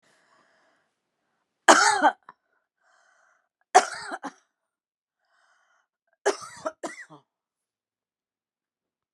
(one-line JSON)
{"three_cough_length": "9.1 s", "three_cough_amplitude": 32701, "three_cough_signal_mean_std_ratio": 0.21, "survey_phase": "beta (2021-08-13 to 2022-03-07)", "age": "65+", "gender": "Female", "wearing_mask": "No", "symptom_none": true, "smoker_status": "Never smoked", "respiratory_condition_asthma": true, "respiratory_condition_other": false, "recruitment_source": "REACT", "submission_delay": "2 days", "covid_test_result": "Negative", "covid_test_method": "RT-qPCR"}